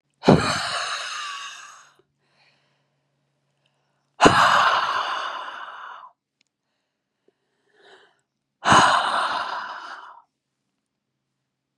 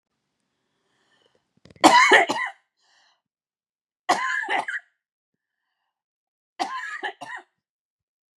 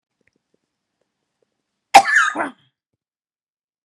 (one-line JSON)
{"exhalation_length": "11.8 s", "exhalation_amplitude": 32767, "exhalation_signal_mean_std_ratio": 0.38, "three_cough_length": "8.4 s", "three_cough_amplitude": 32109, "three_cough_signal_mean_std_ratio": 0.29, "cough_length": "3.8 s", "cough_amplitude": 32768, "cough_signal_mean_std_ratio": 0.22, "survey_phase": "beta (2021-08-13 to 2022-03-07)", "age": "45-64", "gender": "Female", "wearing_mask": "No", "symptom_new_continuous_cough": true, "smoker_status": "Never smoked", "respiratory_condition_asthma": true, "respiratory_condition_other": false, "recruitment_source": "Test and Trace", "submission_delay": "1 day", "covid_test_result": "Negative", "covid_test_method": "RT-qPCR"}